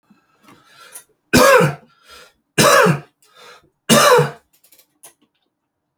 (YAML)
three_cough_length: 6.0 s
three_cough_amplitude: 32767
three_cough_signal_mean_std_ratio: 0.38
survey_phase: beta (2021-08-13 to 2022-03-07)
age: 45-64
gender: Male
wearing_mask: 'No'
symptom_cough_any: true
symptom_fever_high_temperature: true
symptom_onset: 3 days
smoker_status: Ex-smoker
respiratory_condition_asthma: false
respiratory_condition_other: false
recruitment_source: Test and Trace
submission_delay: 1 day
covid_test_result: Positive
covid_test_method: RT-qPCR
covid_ct_value: 17.1
covid_ct_gene: ORF1ab gene
covid_ct_mean: 18.4
covid_viral_load: 910000 copies/ml
covid_viral_load_category: Low viral load (10K-1M copies/ml)